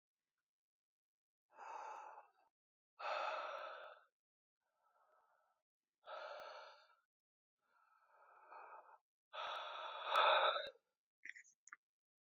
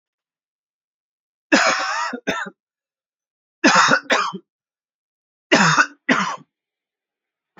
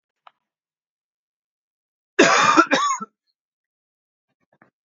{"exhalation_length": "12.3 s", "exhalation_amplitude": 2652, "exhalation_signal_mean_std_ratio": 0.34, "three_cough_length": "7.6 s", "three_cough_amplitude": 28232, "three_cough_signal_mean_std_ratio": 0.39, "cough_length": "4.9 s", "cough_amplitude": 29134, "cough_signal_mean_std_ratio": 0.3, "survey_phase": "beta (2021-08-13 to 2022-03-07)", "age": "18-44", "gender": "Male", "wearing_mask": "No", "symptom_cough_any": true, "symptom_sore_throat": true, "symptom_onset": "5 days", "smoker_status": "Never smoked", "respiratory_condition_asthma": false, "respiratory_condition_other": false, "recruitment_source": "Test and Trace", "submission_delay": "1 day", "covid_test_result": "Positive", "covid_test_method": "RT-qPCR", "covid_ct_value": 22.4, "covid_ct_gene": "N gene"}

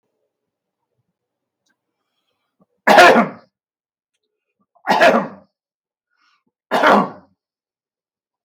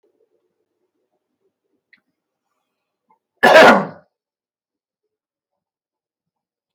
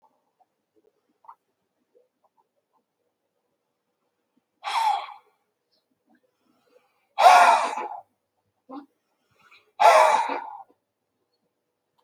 {"three_cough_length": "8.4 s", "three_cough_amplitude": 32768, "three_cough_signal_mean_std_ratio": 0.29, "cough_length": "6.7 s", "cough_amplitude": 32768, "cough_signal_mean_std_ratio": 0.2, "exhalation_length": "12.0 s", "exhalation_amplitude": 26795, "exhalation_signal_mean_std_ratio": 0.27, "survey_phase": "beta (2021-08-13 to 2022-03-07)", "age": "65+", "gender": "Male", "wearing_mask": "No", "symptom_cough_any": true, "symptom_runny_or_blocked_nose": true, "smoker_status": "Ex-smoker", "respiratory_condition_asthma": false, "respiratory_condition_other": false, "recruitment_source": "REACT", "submission_delay": "1 day", "covid_test_result": "Negative", "covid_test_method": "RT-qPCR"}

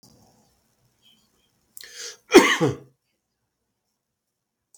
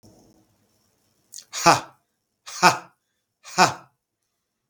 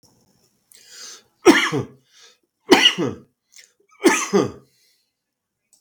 {"cough_length": "4.8 s", "cough_amplitude": 32768, "cough_signal_mean_std_ratio": 0.21, "exhalation_length": "4.7 s", "exhalation_amplitude": 32768, "exhalation_signal_mean_std_ratio": 0.24, "three_cough_length": "5.8 s", "three_cough_amplitude": 32768, "three_cough_signal_mean_std_ratio": 0.32, "survey_phase": "beta (2021-08-13 to 2022-03-07)", "age": "45-64", "gender": "Male", "wearing_mask": "No", "symptom_runny_or_blocked_nose": true, "smoker_status": "Never smoked", "respiratory_condition_asthma": false, "respiratory_condition_other": false, "recruitment_source": "REACT", "submission_delay": "2 days", "covid_test_result": "Negative", "covid_test_method": "RT-qPCR", "influenza_a_test_result": "Negative", "influenza_b_test_result": "Negative"}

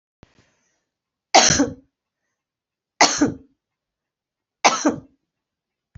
{"three_cough_length": "6.0 s", "three_cough_amplitude": 32768, "three_cough_signal_mean_std_ratio": 0.28, "survey_phase": "alpha (2021-03-01 to 2021-08-12)", "age": "65+", "gender": "Female", "wearing_mask": "No", "symptom_none": true, "smoker_status": "Never smoked", "respiratory_condition_asthma": true, "respiratory_condition_other": false, "recruitment_source": "REACT", "submission_delay": "1 day", "covid_test_result": "Negative", "covid_test_method": "RT-qPCR"}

